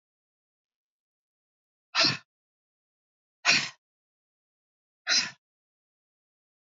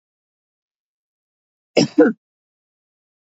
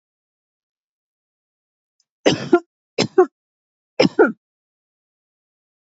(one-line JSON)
{"exhalation_length": "6.7 s", "exhalation_amplitude": 13111, "exhalation_signal_mean_std_ratio": 0.23, "cough_length": "3.2 s", "cough_amplitude": 27786, "cough_signal_mean_std_ratio": 0.21, "three_cough_length": "5.9 s", "three_cough_amplitude": 27494, "three_cough_signal_mean_std_ratio": 0.23, "survey_phase": "beta (2021-08-13 to 2022-03-07)", "age": "45-64", "gender": "Female", "wearing_mask": "No", "symptom_none": true, "smoker_status": "Never smoked", "respiratory_condition_asthma": false, "respiratory_condition_other": false, "recruitment_source": "REACT", "submission_delay": "1 day", "covid_test_result": "Negative", "covid_test_method": "RT-qPCR", "influenza_a_test_result": "Negative", "influenza_b_test_result": "Negative"}